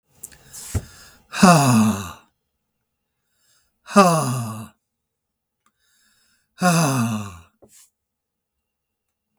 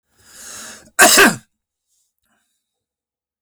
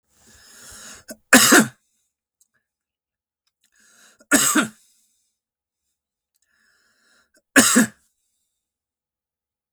exhalation_length: 9.4 s
exhalation_amplitude: 32766
exhalation_signal_mean_std_ratio: 0.35
cough_length: 3.4 s
cough_amplitude: 32768
cough_signal_mean_std_ratio: 0.29
three_cough_length: 9.7 s
three_cough_amplitude: 32768
three_cough_signal_mean_std_ratio: 0.25
survey_phase: beta (2021-08-13 to 2022-03-07)
age: 65+
gender: Male
wearing_mask: 'No'
symptom_runny_or_blocked_nose: true
symptom_onset: 4 days
smoker_status: Never smoked
respiratory_condition_asthma: true
respiratory_condition_other: false
recruitment_source: Test and Trace
submission_delay: 2 days
covid_test_result: Positive
covid_test_method: RT-qPCR
covid_ct_value: 16.9
covid_ct_gene: ORF1ab gene
covid_ct_mean: 17.3
covid_viral_load: 2100000 copies/ml
covid_viral_load_category: High viral load (>1M copies/ml)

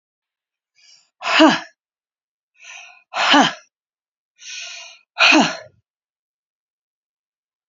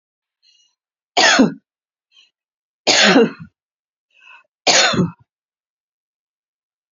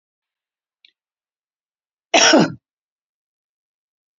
exhalation_length: 7.7 s
exhalation_amplitude: 30014
exhalation_signal_mean_std_ratio: 0.3
three_cough_length: 6.9 s
three_cough_amplitude: 32228
three_cough_signal_mean_std_ratio: 0.34
cough_length: 4.2 s
cough_amplitude: 31838
cough_signal_mean_std_ratio: 0.23
survey_phase: beta (2021-08-13 to 2022-03-07)
age: 65+
gender: Female
wearing_mask: 'No'
symptom_none: true
smoker_status: Never smoked
respiratory_condition_asthma: false
respiratory_condition_other: false
recruitment_source: REACT
submission_delay: 2 days
covid_test_result: Negative
covid_test_method: RT-qPCR
influenza_a_test_result: Unknown/Void
influenza_b_test_result: Unknown/Void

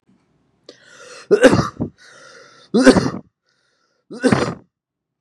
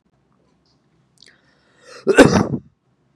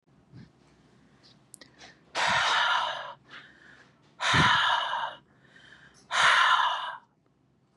three_cough_length: 5.2 s
three_cough_amplitude: 32768
three_cough_signal_mean_std_ratio: 0.34
cough_length: 3.2 s
cough_amplitude: 32768
cough_signal_mean_std_ratio: 0.26
exhalation_length: 7.8 s
exhalation_amplitude: 12464
exhalation_signal_mean_std_ratio: 0.5
survey_phase: beta (2021-08-13 to 2022-03-07)
age: 18-44
gender: Male
wearing_mask: 'No'
symptom_none: true
smoker_status: Never smoked
respiratory_condition_asthma: false
respiratory_condition_other: false
recruitment_source: REACT
submission_delay: 1 day
covid_test_result: Negative
covid_test_method: RT-qPCR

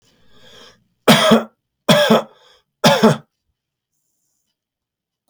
three_cough_length: 5.3 s
three_cough_amplitude: 32063
three_cough_signal_mean_std_ratio: 0.36
survey_phase: beta (2021-08-13 to 2022-03-07)
age: 45-64
gender: Male
wearing_mask: 'No'
symptom_headache: true
smoker_status: Never smoked
respiratory_condition_asthma: false
respiratory_condition_other: false
recruitment_source: REACT
submission_delay: 1 day
covid_test_result: Negative
covid_test_method: RT-qPCR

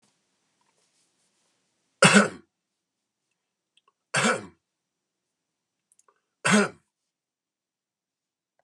three_cough_length: 8.6 s
three_cough_amplitude: 25278
three_cough_signal_mean_std_ratio: 0.22
survey_phase: beta (2021-08-13 to 2022-03-07)
age: 65+
gender: Male
wearing_mask: 'No'
symptom_none: true
smoker_status: Never smoked
respiratory_condition_asthma: false
respiratory_condition_other: false
recruitment_source: REACT
submission_delay: 3 days
covid_test_result: Negative
covid_test_method: RT-qPCR
influenza_a_test_result: Negative
influenza_b_test_result: Negative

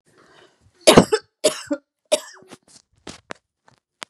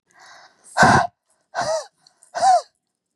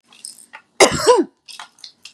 three_cough_length: 4.1 s
three_cough_amplitude: 32768
three_cough_signal_mean_std_ratio: 0.24
exhalation_length: 3.2 s
exhalation_amplitude: 29005
exhalation_signal_mean_std_ratio: 0.4
cough_length: 2.1 s
cough_amplitude: 32768
cough_signal_mean_std_ratio: 0.35
survey_phase: beta (2021-08-13 to 2022-03-07)
age: 45-64
gender: Female
wearing_mask: 'No'
symptom_none: true
smoker_status: Ex-smoker
respiratory_condition_asthma: false
respiratory_condition_other: false
recruitment_source: REACT
submission_delay: 2 days
covid_test_result: Negative
covid_test_method: RT-qPCR
influenza_a_test_result: Negative
influenza_b_test_result: Negative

